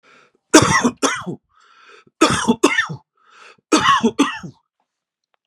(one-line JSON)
{"three_cough_length": "5.5 s", "three_cough_amplitude": 32768, "three_cough_signal_mean_std_ratio": 0.42, "survey_phase": "beta (2021-08-13 to 2022-03-07)", "age": "45-64", "gender": "Male", "wearing_mask": "No", "symptom_runny_or_blocked_nose": true, "symptom_onset": "12 days", "smoker_status": "Ex-smoker", "respiratory_condition_asthma": false, "respiratory_condition_other": false, "recruitment_source": "REACT", "submission_delay": "1 day", "covid_test_result": "Negative", "covid_test_method": "RT-qPCR", "influenza_a_test_result": "Negative", "influenza_b_test_result": "Negative"}